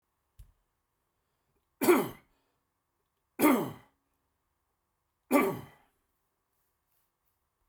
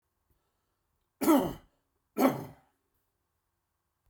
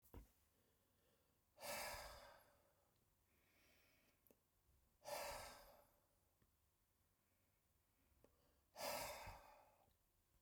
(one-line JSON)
{"three_cough_length": "7.7 s", "three_cough_amplitude": 8976, "three_cough_signal_mean_std_ratio": 0.25, "cough_length": "4.1 s", "cough_amplitude": 8500, "cough_signal_mean_std_ratio": 0.28, "exhalation_length": "10.4 s", "exhalation_amplitude": 464, "exhalation_signal_mean_std_ratio": 0.41, "survey_phase": "beta (2021-08-13 to 2022-03-07)", "age": "45-64", "gender": "Male", "wearing_mask": "No", "symptom_none": true, "smoker_status": "Never smoked", "respiratory_condition_asthma": false, "respiratory_condition_other": false, "recruitment_source": "REACT", "submission_delay": "1 day", "covid_test_result": "Negative", "covid_test_method": "RT-qPCR"}